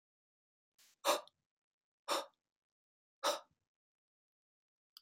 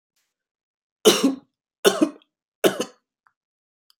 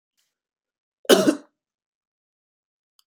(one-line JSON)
{"exhalation_length": "5.0 s", "exhalation_amplitude": 3830, "exhalation_signal_mean_std_ratio": 0.23, "three_cough_length": "4.0 s", "three_cough_amplitude": 29593, "three_cough_signal_mean_std_ratio": 0.28, "cough_length": "3.1 s", "cough_amplitude": 28344, "cough_signal_mean_std_ratio": 0.21, "survey_phase": "beta (2021-08-13 to 2022-03-07)", "age": "45-64", "gender": "Male", "wearing_mask": "No", "symptom_none": true, "smoker_status": "Never smoked", "respiratory_condition_asthma": false, "respiratory_condition_other": false, "recruitment_source": "REACT", "submission_delay": "0 days", "covid_test_result": "Negative", "covid_test_method": "RT-qPCR", "influenza_a_test_result": "Negative", "influenza_b_test_result": "Negative"}